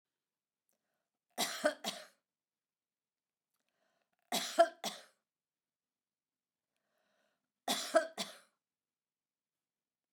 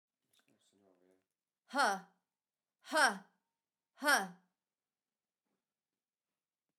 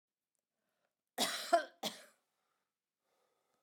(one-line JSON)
{"three_cough_length": "10.1 s", "three_cough_amplitude": 7061, "three_cough_signal_mean_std_ratio": 0.23, "exhalation_length": "6.8 s", "exhalation_amplitude": 5307, "exhalation_signal_mean_std_ratio": 0.25, "cough_length": "3.6 s", "cough_amplitude": 4979, "cough_signal_mean_std_ratio": 0.25, "survey_phase": "beta (2021-08-13 to 2022-03-07)", "age": "65+", "gender": "Female", "wearing_mask": "No", "symptom_none": true, "smoker_status": "Ex-smoker", "respiratory_condition_asthma": false, "respiratory_condition_other": false, "recruitment_source": "REACT", "submission_delay": "6 days", "covid_test_result": "Negative", "covid_test_method": "RT-qPCR"}